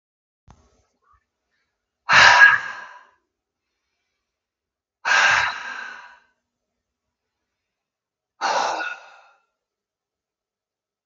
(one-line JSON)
{"exhalation_length": "11.1 s", "exhalation_amplitude": 32767, "exhalation_signal_mean_std_ratio": 0.28, "survey_phase": "beta (2021-08-13 to 2022-03-07)", "age": "45-64", "gender": "Male", "wearing_mask": "No", "symptom_none": true, "smoker_status": "Ex-smoker", "respiratory_condition_asthma": true, "respiratory_condition_other": false, "recruitment_source": "Test and Trace", "submission_delay": "1 day", "covid_test_result": "Negative", "covid_test_method": "ePCR"}